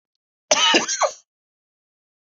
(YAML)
cough_length: 2.4 s
cough_amplitude: 29372
cough_signal_mean_std_ratio: 0.37
survey_phase: beta (2021-08-13 to 2022-03-07)
age: 45-64
gender: Male
wearing_mask: 'No'
symptom_sore_throat: true
smoker_status: Never smoked
respiratory_condition_asthma: false
respiratory_condition_other: false
recruitment_source: Test and Trace
submission_delay: 1 day
covid_test_result: Positive
covid_test_method: ePCR